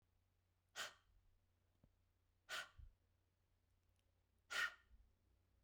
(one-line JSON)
{"exhalation_length": "5.6 s", "exhalation_amplitude": 935, "exhalation_signal_mean_std_ratio": 0.28, "survey_phase": "beta (2021-08-13 to 2022-03-07)", "age": "45-64", "gender": "Female", "wearing_mask": "No", "symptom_none": true, "smoker_status": "Never smoked", "respiratory_condition_asthma": false, "respiratory_condition_other": false, "recruitment_source": "REACT", "submission_delay": "1 day", "covid_test_result": "Positive", "covid_test_method": "RT-qPCR", "covid_ct_value": 36.0, "covid_ct_gene": "E gene", "influenza_a_test_result": "Negative", "influenza_b_test_result": "Negative"}